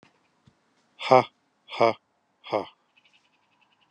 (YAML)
exhalation_length: 3.9 s
exhalation_amplitude: 25121
exhalation_signal_mean_std_ratio: 0.22
survey_phase: beta (2021-08-13 to 2022-03-07)
age: 45-64
gender: Male
wearing_mask: 'No'
symptom_none: true
smoker_status: Ex-smoker
respiratory_condition_asthma: false
respiratory_condition_other: false
recruitment_source: REACT
submission_delay: 2 days
covid_test_result: Negative
covid_test_method: RT-qPCR